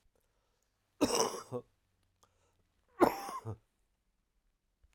{"cough_length": "4.9 s", "cough_amplitude": 9276, "cough_signal_mean_std_ratio": 0.27, "survey_phase": "alpha (2021-03-01 to 2021-08-12)", "age": "45-64", "gender": "Male", "wearing_mask": "No", "symptom_shortness_of_breath": true, "symptom_fatigue": true, "symptom_headache": true, "symptom_loss_of_taste": true, "symptom_onset": "6 days", "smoker_status": "Never smoked", "respiratory_condition_asthma": false, "respiratory_condition_other": false, "recruitment_source": "Test and Trace", "submission_delay": "1 day", "covid_test_result": "Positive", "covid_test_method": "RT-qPCR", "covid_ct_value": 14.8, "covid_ct_gene": "ORF1ab gene", "covid_ct_mean": 15.7, "covid_viral_load": "6900000 copies/ml", "covid_viral_load_category": "High viral load (>1M copies/ml)"}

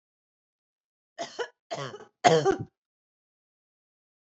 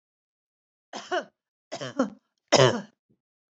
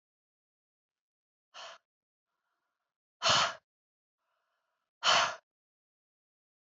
{"cough_length": "4.3 s", "cough_amplitude": 21453, "cough_signal_mean_std_ratio": 0.26, "three_cough_length": "3.6 s", "three_cough_amplitude": 22091, "three_cough_signal_mean_std_ratio": 0.28, "exhalation_length": "6.7 s", "exhalation_amplitude": 7470, "exhalation_signal_mean_std_ratio": 0.24, "survey_phase": "beta (2021-08-13 to 2022-03-07)", "age": "45-64", "gender": "Female", "wearing_mask": "No", "symptom_none": true, "smoker_status": "Never smoked", "respiratory_condition_asthma": false, "respiratory_condition_other": false, "recruitment_source": "REACT", "submission_delay": "1 day", "covid_test_result": "Negative", "covid_test_method": "RT-qPCR"}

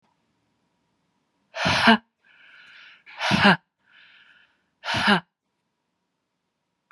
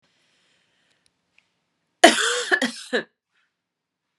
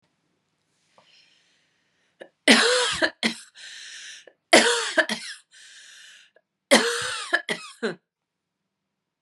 {"exhalation_length": "6.9 s", "exhalation_amplitude": 28590, "exhalation_signal_mean_std_ratio": 0.3, "cough_length": "4.2 s", "cough_amplitude": 32768, "cough_signal_mean_std_ratio": 0.26, "three_cough_length": "9.2 s", "three_cough_amplitude": 31307, "three_cough_signal_mean_std_ratio": 0.35, "survey_phase": "beta (2021-08-13 to 2022-03-07)", "age": "45-64", "gender": "Female", "wearing_mask": "No", "symptom_cough_any": true, "symptom_runny_or_blocked_nose": true, "symptom_abdominal_pain": true, "symptom_fever_high_temperature": true, "symptom_headache": true, "symptom_change_to_sense_of_smell_or_taste": true, "symptom_loss_of_taste": true, "symptom_onset": "3 days", "smoker_status": "Never smoked", "respiratory_condition_asthma": true, "respiratory_condition_other": false, "recruitment_source": "Test and Trace", "submission_delay": "2 days", "covid_test_result": "Positive", "covid_test_method": "RT-qPCR", "covid_ct_value": 16.1, "covid_ct_gene": "ORF1ab gene", "covid_ct_mean": 16.5, "covid_viral_load": "3900000 copies/ml", "covid_viral_load_category": "High viral load (>1M copies/ml)"}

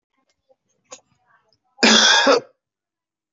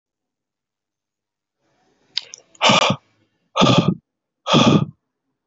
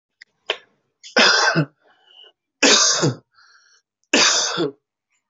{"cough_length": "3.3 s", "cough_amplitude": 27922, "cough_signal_mean_std_ratio": 0.35, "exhalation_length": "5.5 s", "exhalation_amplitude": 27783, "exhalation_signal_mean_std_ratio": 0.35, "three_cough_length": "5.3 s", "three_cough_amplitude": 32494, "three_cough_signal_mean_std_ratio": 0.45, "survey_phase": "alpha (2021-03-01 to 2021-08-12)", "age": "45-64", "gender": "Male", "wearing_mask": "No", "symptom_cough_any": true, "symptom_fatigue": true, "smoker_status": "Never smoked", "respiratory_condition_asthma": false, "respiratory_condition_other": false, "recruitment_source": "Test and Trace", "submission_delay": "0 days", "covid_test_result": "Positive", "covid_test_method": "RT-qPCR", "covid_ct_value": 29.2, "covid_ct_gene": "N gene"}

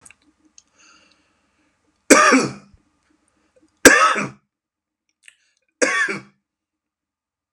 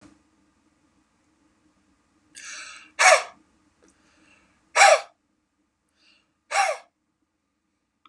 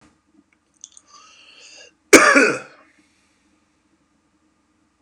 {"three_cough_length": "7.5 s", "three_cough_amplitude": 32768, "three_cough_signal_mean_std_ratio": 0.28, "exhalation_length": "8.1 s", "exhalation_amplitude": 28064, "exhalation_signal_mean_std_ratio": 0.23, "cough_length": "5.0 s", "cough_amplitude": 32768, "cough_signal_mean_std_ratio": 0.23, "survey_phase": "beta (2021-08-13 to 2022-03-07)", "age": "45-64", "gender": "Male", "wearing_mask": "No", "symptom_none": true, "symptom_onset": "8 days", "smoker_status": "Ex-smoker", "respiratory_condition_asthma": false, "respiratory_condition_other": false, "recruitment_source": "Test and Trace", "submission_delay": "4 days", "covid_test_result": "Negative", "covid_test_method": "RT-qPCR"}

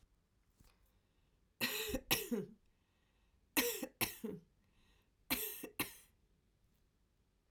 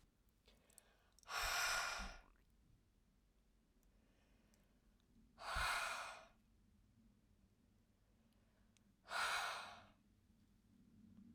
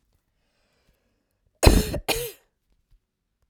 {"three_cough_length": "7.5 s", "three_cough_amplitude": 4240, "three_cough_signal_mean_std_ratio": 0.37, "exhalation_length": "11.3 s", "exhalation_amplitude": 1105, "exhalation_signal_mean_std_ratio": 0.41, "cough_length": "3.5 s", "cough_amplitude": 32768, "cough_signal_mean_std_ratio": 0.25, "survey_phase": "beta (2021-08-13 to 2022-03-07)", "age": "45-64", "gender": "Female", "wearing_mask": "No", "symptom_cough_any": true, "symptom_runny_or_blocked_nose": true, "symptom_sore_throat": true, "symptom_fatigue": true, "symptom_headache": true, "symptom_loss_of_taste": true, "smoker_status": "Ex-smoker", "respiratory_condition_asthma": false, "respiratory_condition_other": false, "recruitment_source": "Test and Trace", "submission_delay": "2 days", "covid_test_result": "Positive", "covid_test_method": "RT-qPCR", "covid_ct_value": 10.4, "covid_ct_gene": "ORF1ab gene", "covid_ct_mean": 10.6, "covid_viral_load": "330000000 copies/ml", "covid_viral_load_category": "High viral load (>1M copies/ml)"}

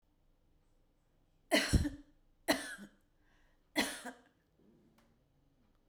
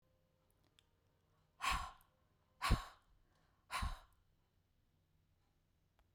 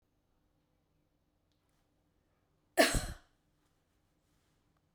{"three_cough_length": "5.9 s", "three_cough_amplitude": 4725, "three_cough_signal_mean_std_ratio": 0.29, "exhalation_length": "6.1 s", "exhalation_amplitude": 3090, "exhalation_signal_mean_std_ratio": 0.27, "cough_length": "4.9 s", "cough_amplitude": 7599, "cough_signal_mean_std_ratio": 0.18, "survey_phase": "beta (2021-08-13 to 2022-03-07)", "age": "65+", "gender": "Female", "wearing_mask": "No", "symptom_none": true, "smoker_status": "Never smoked", "respiratory_condition_asthma": false, "respiratory_condition_other": false, "recruitment_source": "REACT", "submission_delay": "1 day", "covid_test_result": "Negative", "covid_test_method": "RT-qPCR"}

